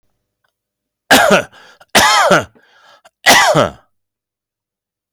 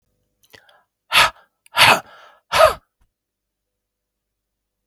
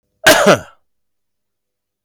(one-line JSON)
{"three_cough_length": "5.1 s", "three_cough_amplitude": 32768, "three_cough_signal_mean_std_ratio": 0.42, "exhalation_length": "4.9 s", "exhalation_amplitude": 32768, "exhalation_signal_mean_std_ratio": 0.27, "cough_length": "2.0 s", "cough_amplitude": 32768, "cough_signal_mean_std_ratio": 0.33, "survey_phase": "beta (2021-08-13 to 2022-03-07)", "age": "45-64", "gender": "Male", "wearing_mask": "No", "symptom_none": true, "symptom_onset": "11 days", "smoker_status": "Ex-smoker", "respiratory_condition_asthma": false, "respiratory_condition_other": false, "recruitment_source": "REACT", "submission_delay": "2 days", "covid_test_result": "Positive", "covid_test_method": "RT-qPCR", "covid_ct_value": 19.9, "covid_ct_gene": "E gene", "influenza_a_test_result": "Negative", "influenza_b_test_result": "Negative"}